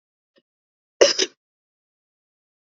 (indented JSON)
{
  "cough_length": "2.6 s",
  "cough_amplitude": 28367,
  "cough_signal_mean_std_ratio": 0.19,
  "survey_phase": "beta (2021-08-13 to 2022-03-07)",
  "age": "45-64",
  "gender": "Female",
  "wearing_mask": "No",
  "symptom_cough_any": true,
  "symptom_new_continuous_cough": true,
  "symptom_runny_or_blocked_nose": true,
  "symptom_fatigue": true,
  "symptom_onset": "4 days",
  "smoker_status": "Never smoked",
  "respiratory_condition_asthma": false,
  "respiratory_condition_other": false,
  "recruitment_source": "Test and Trace",
  "submission_delay": "2 days",
  "covid_test_result": "Positive",
  "covid_test_method": "RT-qPCR",
  "covid_ct_value": 13.5,
  "covid_ct_gene": "ORF1ab gene"
}